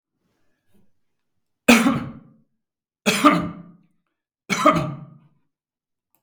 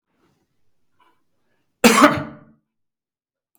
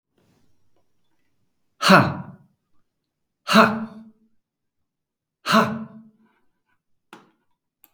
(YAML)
three_cough_length: 6.2 s
three_cough_amplitude: 32768
three_cough_signal_mean_std_ratio: 0.32
cough_length: 3.6 s
cough_amplitude: 32768
cough_signal_mean_std_ratio: 0.24
exhalation_length: 7.9 s
exhalation_amplitude: 32766
exhalation_signal_mean_std_ratio: 0.26
survey_phase: beta (2021-08-13 to 2022-03-07)
age: 45-64
gender: Male
wearing_mask: 'No'
symptom_none: true
smoker_status: Never smoked
respiratory_condition_asthma: false
respiratory_condition_other: false
recruitment_source: REACT
submission_delay: 1 day
covid_test_result: Negative
covid_test_method: RT-qPCR
influenza_a_test_result: Unknown/Void
influenza_b_test_result: Unknown/Void